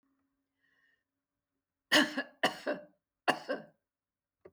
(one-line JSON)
{"three_cough_length": "4.5 s", "three_cough_amplitude": 8798, "three_cough_signal_mean_std_ratio": 0.28, "survey_phase": "beta (2021-08-13 to 2022-03-07)", "age": "65+", "gender": "Female", "wearing_mask": "No", "symptom_none": true, "smoker_status": "Never smoked", "respiratory_condition_asthma": false, "respiratory_condition_other": false, "recruitment_source": "Test and Trace", "submission_delay": "0 days", "covid_test_result": "Negative", "covid_test_method": "LFT"}